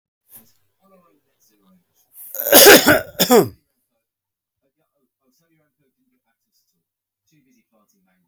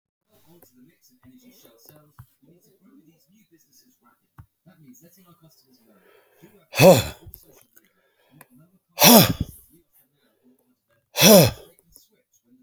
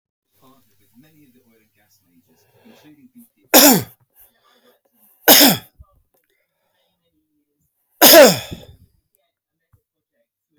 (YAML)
cough_length: 8.3 s
cough_amplitude: 32768
cough_signal_mean_std_ratio: 0.24
exhalation_length: 12.6 s
exhalation_amplitude: 32767
exhalation_signal_mean_std_ratio: 0.22
three_cough_length: 10.6 s
three_cough_amplitude: 32768
three_cough_signal_mean_std_ratio: 0.25
survey_phase: beta (2021-08-13 to 2022-03-07)
age: 65+
gender: Male
wearing_mask: 'No'
symptom_none: true
smoker_status: Ex-smoker
respiratory_condition_asthma: false
respiratory_condition_other: false
recruitment_source: REACT
submission_delay: 2 days
covid_test_result: Negative
covid_test_method: RT-qPCR